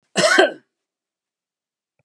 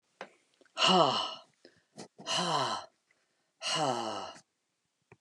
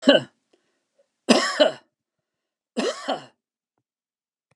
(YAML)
cough_length: 2.0 s
cough_amplitude: 32768
cough_signal_mean_std_ratio: 0.33
exhalation_length: 5.2 s
exhalation_amplitude: 9552
exhalation_signal_mean_std_ratio: 0.45
three_cough_length: 4.6 s
three_cough_amplitude: 31956
three_cough_signal_mean_std_ratio: 0.3
survey_phase: beta (2021-08-13 to 2022-03-07)
age: 65+
gender: Male
wearing_mask: 'No'
symptom_runny_or_blocked_nose: true
smoker_status: Never smoked
respiratory_condition_asthma: false
respiratory_condition_other: false
recruitment_source: REACT
submission_delay: 0 days
covid_test_result: Negative
covid_test_method: RT-qPCR
influenza_a_test_result: Negative
influenza_b_test_result: Negative